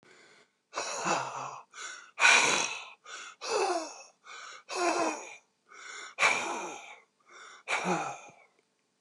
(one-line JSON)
{"exhalation_length": "9.0 s", "exhalation_amplitude": 13172, "exhalation_signal_mean_std_ratio": 0.5, "survey_phase": "beta (2021-08-13 to 2022-03-07)", "age": "65+", "gender": "Male", "wearing_mask": "No", "symptom_cough_any": true, "symptom_runny_or_blocked_nose": true, "symptom_change_to_sense_of_smell_or_taste": true, "symptom_loss_of_taste": true, "symptom_onset": "2 days", "smoker_status": "Never smoked", "respiratory_condition_asthma": false, "respiratory_condition_other": false, "recruitment_source": "Test and Trace", "submission_delay": "2 days", "covid_test_result": "Positive", "covid_test_method": "RT-qPCR", "covid_ct_value": 18.4, "covid_ct_gene": "S gene", "covid_ct_mean": 18.6, "covid_viral_load": "780000 copies/ml", "covid_viral_load_category": "Low viral load (10K-1M copies/ml)"}